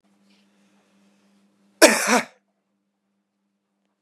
{"cough_length": "4.0 s", "cough_amplitude": 32768, "cough_signal_mean_std_ratio": 0.21, "survey_phase": "beta (2021-08-13 to 2022-03-07)", "age": "45-64", "gender": "Male", "wearing_mask": "No", "symptom_runny_or_blocked_nose": true, "smoker_status": "Never smoked", "respiratory_condition_asthma": false, "respiratory_condition_other": false, "recruitment_source": "REACT", "submission_delay": "3 days", "covid_test_result": "Negative", "covid_test_method": "RT-qPCR", "influenza_a_test_result": "Negative", "influenza_b_test_result": "Negative"}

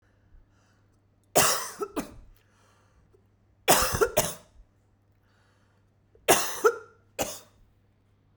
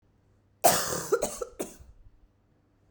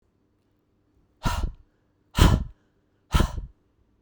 {"three_cough_length": "8.4 s", "three_cough_amplitude": 23769, "three_cough_signal_mean_std_ratio": 0.32, "cough_length": "2.9 s", "cough_amplitude": 16547, "cough_signal_mean_std_ratio": 0.36, "exhalation_length": "4.0 s", "exhalation_amplitude": 26344, "exhalation_signal_mean_std_ratio": 0.31, "survey_phase": "beta (2021-08-13 to 2022-03-07)", "age": "45-64", "gender": "Female", "wearing_mask": "No", "symptom_cough_any": true, "symptom_new_continuous_cough": true, "symptom_runny_or_blocked_nose": true, "symptom_headache": true, "symptom_onset": "3 days", "smoker_status": "Never smoked", "respiratory_condition_asthma": false, "respiratory_condition_other": false, "recruitment_source": "Test and Trace", "submission_delay": "2 days", "covid_test_result": "Positive", "covid_test_method": "RT-qPCR", "covid_ct_value": 30.4, "covid_ct_gene": "ORF1ab gene"}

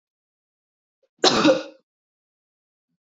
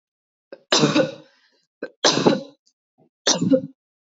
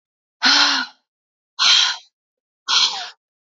{"cough_length": "3.1 s", "cough_amplitude": 24889, "cough_signal_mean_std_ratio": 0.27, "three_cough_length": "4.0 s", "three_cough_amplitude": 26251, "three_cough_signal_mean_std_ratio": 0.41, "exhalation_length": "3.6 s", "exhalation_amplitude": 25158, "exhalation_signal_mean_std_ratio": 0.46, "survey_phase": "beta (2021-08-13 to 2022-03-07)", "age": "18-44", "gender": "Female", "wearing_mask": "No", "symptom_cough_any": true, "symptom_runny_or_blocked_nose": true, "symptom_sore_throat": true, "symptom_fatigue": true, "symptom_headache": true, "symptom_other": true, "symptom_onset": "2 days", "smoker_status": "Never smoked", "respiratory_condition_asthma": false, "respiratory_condition_other": false, "recruitment_source": "Test and Trace", "submission_delay": "1 day", "covid_test_result": "Positive", "covid_test_method": "RT-qPCR", "covid_ct_value": 22.1, "covid_ct_gene": "ORF1ab gene", "covid_ct_mean": 22.7, "covid_viral_load": "37000 copies/ml", "covid_viral_load_category": "Low viral load (10K-1M copies/ml)"}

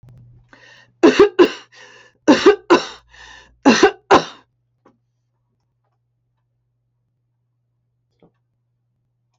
{"three_cough_length": "9.4 s", "three_cough_amplitude": 29473, "three_cough_signal_mean_std_ratio": 0.27, "survey_phase": "beta (2021-08-13 to 2022-03-07)", "age": "65+", "gender": "Female", "wearing_mask": "No", "symptom_none": true, "smoker_status": "Ex-smoker", "respiratory_condition_asthma": false, "respiratory_condition_other": false, "recruitment_source": "REACT", "submission_delay": "1 day", "covid_test_result": "Negative", "covid_test_method": "RT-qPCR"}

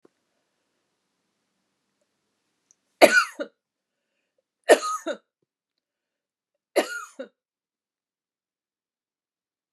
{"three_cough_length": "9.7 s", "three_cough_amplitude": 29204, "three_cough_signal_mean_std_ratio": 0.18, "survey_phase": "alpha (2021-03-01 to 2021-08-12)", "age": "65+", "gender": "Female", "wearing_mask": "No", "symptom_none": true, "smoker_status": "Never smoked", "respiratory_condition_asthma": false, "respiratory_condition_other": false, "recruitment_source": "REACT", "submission_delay": "1 day", "covid_test_result": "Negative", "covid_test_method": "RT-qPCR"}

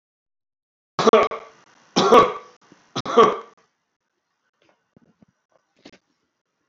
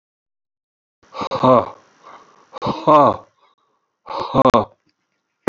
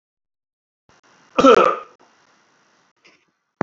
{"three_cough_length": "6.7 s", "three_cough_amplitude": 29157, "three_cough_signal_mean_std_ratio": 0.28, "exhalation_length": "5.5 s", "exhalation_amplitude": 29780, "exhalation_signal_mean_std_ratio": 0.35, "cough_length": "3.6 s", "cough_amplitude": 27854, "cough_signal_mean_std_ratio": 0.25, "survey_phase": "beta (2021-08-13 to 2022-03-07)", "age": "45-64", "gender": "Male", "wearing_mask": "No", "symptom_none": true, "smoker_status": "Never smoked", "respiratory_condition_asthma": false, "respiratory_condition_other": false, "recruitment_source": "REACT", "submission_delay": "1 day", "covid_test_result": "Negative", "covid_test_method": "RT-qPCR", "influenza_a_test_result": "Negative", "influenza_b_test_result": "Negative"}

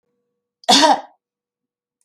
{"cough_length": "2.0 s", "cough_amplitude": 32768, "cough_signal_mean_std_ratio": 0.31, "survey_phase": "alpha (2021-03-01 to 2021-08-12)", "age": "65+", "gender": "Female", "wearing_mask": "No", "symptom_none": true, "smoker_status": "Never smoked", "respiratory_condition_asthma": false, "respiratory_condition_other": false, "recruitment_source": "REACT", "submission_delay": "3 days", "covid_test_result": "Negative", "covid_test_method": "RT-qPCR"}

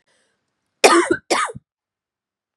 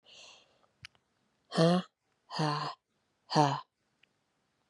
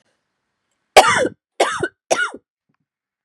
{"cough_length": "2.6 s", "cough_amplitude": 32768, "cough_signal_mean_std_ratio": 0.32, "exhalation_length": "4.7 s", "exhalation_amplitude": 10845, "exhalation_signal_mean_std_ratio": 0.32, "three_cough_length": "3.2 s", "three_cough_amplitude": 32768, "three_cough_signal_mean_std_ratio": 0.33, "survey_phase": "beta (2021-08-13 to 2022-03-07)", "age": "18-44", "gender": "Female", "wearing_mask": "No", "symptom_cough_any": true, "symptom_runny_or_blocked_nose": true, "symptom_headache": true, "symptom_change_to_sense_of_smell_or_taste": true, "symptom_loss_of_taste": true, "smoker_status": "Never smoked", "respiratory_condition_asthma": false, "respiratory_condition_other": false, "recruitment_source": "Test and Trace", "submission_delay": "1 day", "covid_test_result": "Positive", "covid_test_method": "RT-qPCR", "covid_ct_value": 14.0, "covid_ct_gene": "ORF1ab gene", "covid_ct_mean": 15.0, "covid_viral_load": "12000000 copies/ml", "covid_viral_load_category": "High viral load (>1M copies/ml)"}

